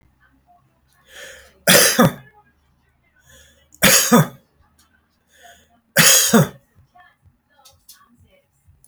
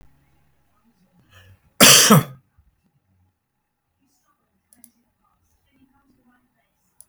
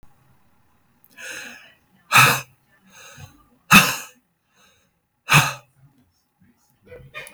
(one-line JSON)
{"three_cough_length": "8.9 s", "three_cough_amplitude": 32768, "three_cough_signal_mean_std_ratio": 0.32, "cough_length": "7.1 s", "cough_amplitude": 32768, "cough_signal_mean_std_ratio": 0.2, "exhalation_length": "7.3 s", "exhalation_amplitude": 32768, "exhalation_signal_mean_std_ratio": 0.26, "survey_phase": "beta (2021-08-13 to 2022-03-07)", "age": "65+", "gender": "Male", "wearing_mask": "No", "symptom_none": true, "smoker_status": "Ex-smoker", "respiratory_condition_asthma": false, "respiratory_condition_other": false, "recruitment_source": "REACT", "submission_delay": "2 days", "covid_test_result": "Negative", "covid_test_method": "RT-qPCR"}